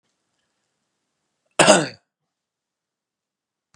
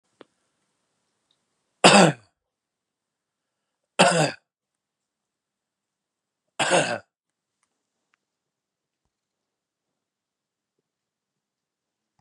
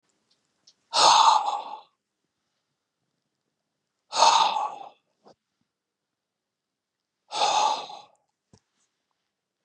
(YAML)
cough_length: 3.8 s
cough_amplitude: 32767
cough_signal_mean_std_ratio: 0.19
three_cough_length: 12.2 s
three_cough_amplitude: 32762
three_cough_signal_mean_std_ratio: 0.2
exhalation_length: 9.6 s
exhalation_amplitude: 18427
exhalation_signal_mean_std_ratio: 0.33
survey_phase: beta (2021-08-13 to 2022-03-07)
age: 45-64
gender: Male
wearing_mask: 'No'
symptom_none: true
smoker_status: Never smoked
respiratory_condition_asthma: false
respiratory_condition_other: false
recruitment_source: REACT
submission_delay: 2 days
covid_test_result: Negative
covid_test_method: RT-qPCR
influenza_a_test_result: Negative
influenza_b_test_result: Negative